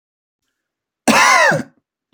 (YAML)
cough_length: 2.1 s
cough_amplitude: 32768
cough_signal_mean_std_ratio: 0.43
survey_phase: beta (2021-08-13 to 2022-03-07)
age: 18-44
gender: Male
wearing_mask: 'No'
symptom_none: true
smoker_status: Ex-smoker
respiratory_condition_asthma: false
respiratory_condition_other: false
recruitment_source: REACT
submission_delay: 2 days
covid_test_result: Negative
covid_test_method: RT-qPCR
influenza_a_test_result: Negative
influenza_b_test_result: Negative